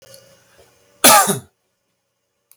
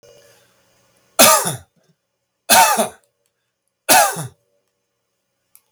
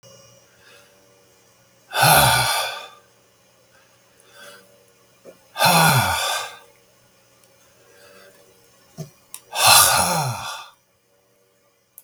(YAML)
cough_length: 2.6 s
cough_amplitude: 32768
cough_signal_mean_std_ratio: 0.29
three_cough_length: 5.7 s
three_cough_amplitude: 32768
three_cough_signal_mean_std_ratio: 0.33
exhalation_length: 12.0 s
exhalation_amplitude: 32768
exhalation_signal_mean_std_ratio: 0.38
survey_phase: beta (2021-08-13 to 2022-03-07)
age: 65+
gender: Male
wearing_mask: 'No'
symptom_none: true
smoker_status: Never smoked
respiratory_condition_asthma: false
respiratory_condition_other: false
recruitment_source: REACT
submission_delay: 4 days
covid_test_result: Negative
covid_test_method: RT-qPCR
influenza_a_test_result: Unknown/Void
influenza_b_test_result: Unknown/Void